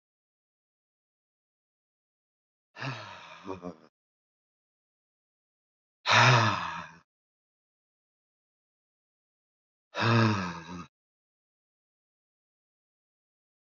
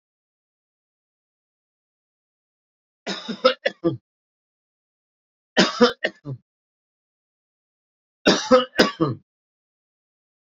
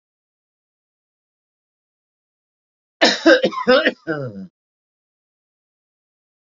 {"exhalation_length": "13.7 s", "exhalation_amplitude": 14078, "exhalation_signal_mean_std_ratio": 0.25, "three_cough_length": "10.6 s", "three_cough_amplitude": 28596, "three_cough_signal_mean_std_ratio": 0.25, "cough_length": "6.5 s", "cough_amplitude": 30979, "cough_signal_mean_std_ratio": 0.27, "survey_phase": "beta (2021-08-13 to 2022-03-07)", "age": "65+", "gender": "Male", "wearing_mask": "No", "symptom_none": true, "smoker_status": "Ex-smoker", "respiratory_condition_asthma": false, "respiratory_condition_other": false, "recruitment_source": "REACT", "submission_delay": "3 days", "covid_test_result": "Negative", "covid_test_method": "RT-qPCR", "influenza_a_test_result": "Unknown/Void", "influenza_b_test_result": "Unknown/Void"}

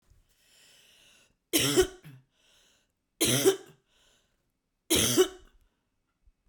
{"three_cough_length": "6.5 s", "three_cough_amplitude": 12398, "three_cough_signal_mean_std_ratio": 0.33, "survey_phase": "beta (2021-08-13 to 2022-03-07)", "age": "45-64", "gender": "Female", "wearing_mask": "No", "symptom_none": true, "symptom_onset": "7 days", "smoker_status": "Ex-smoker", "respiratory_condition_asthma": false, "respiratory_condition_other": false, "recruitment_source": "REACT", "submission_delay": "1 day", "covid_test_result": "Negative", "covid_test_method": "RT-qPCR", "influenza_a_test_result": "Unknown/Void", "influenza_b_test_result": "Unknown/Void"}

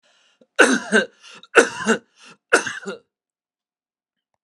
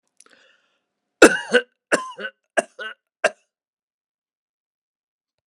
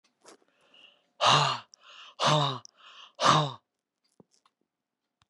{"three_cough_length": "4.4 s", "three_cough_amplitude": 32767, "three_cough_signal_mean_std_ratio": 0.32, "cough_length": "5.5 s", "cough_amplitude": 32768, "cough_signal_mean_std_ratio": 0.2, "exhalation_length": "5.3 s", "exhalation_amplitude": 15438, "exhalation_signal_mean_std_ratio": 0.36, "survey_phase": "beta (2021-08-13 to 2022-03-07)", "age": "65+", "gender": "Male", "wearing_mask": "No", "symptom_none": true, "smoker_status": "Never smoked", "respiratory_condition_asthma": false, "respiratory_condition_other": false, "recruitment_source": "REACT", "submission_delay": "1 day", "covid_test_result": "Negative", "covid_test_method": "RT-qPCR", "influenza_a_test_result": "Negative", "influenza_b_test_result": "Negative"}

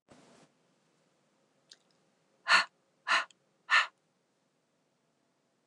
{"exhalation_length": "5.7 s", "exhalation_amplitude": 9834, "exhalation_signal_mean_std_ratio": 0.23, "survey_phase": "alpha (2021-03-01 to 2021-08-12)", "age": "45-64", "gender": "Female", "wearing_mask": "No", "symptom_none": true, "smoker_status": "Never smoked", "respiratory_condition_asthma": false, "respiratory_condition_other": false, "recruitment_source": "REACT", "submission_delay": "2 days", "covid_test_result": "Negative", "covid_test_method": "RT-qPCR"}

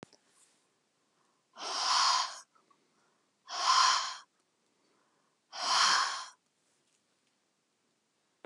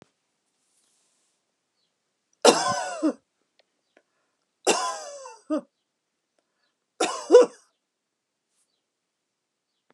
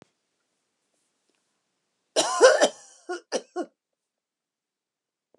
{"exhalation_length": "8.5 s", "exhalation_amplitude": 6939, "exhalation_signal_mean_std_ratio": 0.38, "three_cough_length": "9.9 s", "three_cough_amplitude": 29313, "three_cough_signal_mean_std_ratio": 0.24, "cough_length": "5.4 s", "cough_amplitude": 26726, "cough_signal_mean_std_ratio": 0.25, "survey_phase": "alpha (2021-03-01 to 2021-08-12)", "age": "65+", "gender": "Female", "wearing_mask": "No", "symptom_none": true, "smoker_status": "Never smoked", "respiratory_condition_asthma": false, "respiratory_condition_other": false, "recruitment_source": "REACT", "submission_delay": "1 day", "covid_test_result": "Negative", "covid_test_method": "RT-qPCR"}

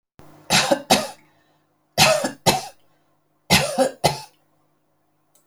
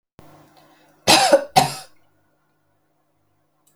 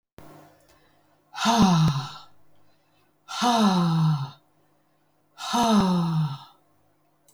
{"three_cough_length": "5.5 s", "three_cough_amplitude": 31817, "three_cough_signal_mean_std_ratio": 0.39, "cough_length": "3.8 s", "cough_amplitude": 32767, "cough_signal_mean_std_ratio": 0.29, "exhalation_length": "7.3 s", "exhalation_amplitude": 13024, "exhalation_signal_mean_std_ratio": 0.55, "survey_phase": "alpha (2021-03-01 to 2021-08-12)", "age": "65+", "gender": "Female", "wearing_mask": "No", "symptom_none": true, "smoker_status": "Ex-smoker", "respiratory_condition_asthma": false, "respiratory_condition_other": false, "recruitment_source": "REACT", "submission_delay": "1 day", "covid_test_result": "Negative", "covid_test_method": "RT-qPCR"}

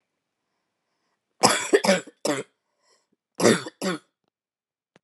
{"cough_length": "5.0 s", "cough_amplitude": 30349, "cough_signal_mean_std_ratio": 0.32, "survey_phase": "beta (2021-08-13 to 2022-03-07)", "age": "18-44", "gender": "Female", "wearing_mask": "No", "symptom_cough_any": true, "symptom_runny_or_blocked_nose": true, "symptom_abdominal_pain": true, "symptom_headache": true, "symptom_onset": "3 days", "smoker_status": "Current smoker (1 to 10 cigarettes per day)", "respiratory_condition_asthma": false, "respiratory_condition_other": false, "recruitment_source": "Test and Trace", "submission_delay": "2 days", "covid_test_result": "Positive", "covid_test_method": "RT-qPCR", "covid_ct_value": 31.9, "covid_ct_gene": "ORF1ab gene"}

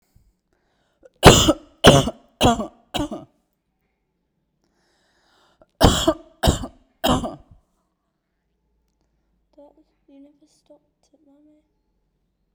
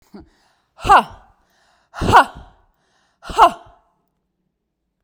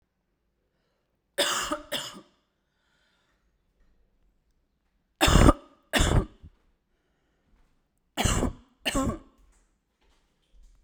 {"cough_length": "12.5 s", "cough_amplitude": 32768, "cough_signal_mean_std_ratio": 0.25, "exhalation_length": "5.0 s", "exhalation_amplitude": 32768, "exhalation_signal_mean_std_ratio": 0.27, "three_cough_length": "10.8 s", "three_cough_amplitude": 25913, "three_cough_signal_mean_std_ratio": 0.29, "survey_phase": "beta (2021-08-13 to 2022-03-07)", "age": "18-44", "gender": "Female", "wearing_mask": "No", "symptom_none": true, "smoker_status": "Ex-smoker", "respiratory_condition_asthma": false, "respiratory_condition_other": false, "recruitment_source": "REACT", "submission_delay": "1 day", "covid_test_result": "Negative", "covid_test_method": "RT-qPCR"}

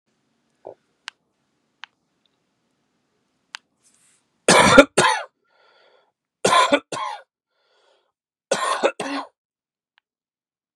{"three_cough_length": "10.8 s", "three_cough_amplitude": 32768, "three_cough_signal_mean_std_ratio": 0.27, "survey_phase": "beta (2021-08-13 to 2022-03-07)", "age": "45-64", "gender": "Male", "wearing_mask": "No", "symptom_cough_any": true, "symptom_runny_or_blocked_nose": true, "smoker_status": "Never smoked", "respiratory_condition_asthma": false, "respiratory_condition_other": false, "recruitment_source": "Test and Trace", "submission_delay": "1 day", "covid_test_result": "Positive", "covid_test_method": "RT-qPCR", "covid_ct_value": 15.7, "covid_ct_gene": "ORF1ab gene"}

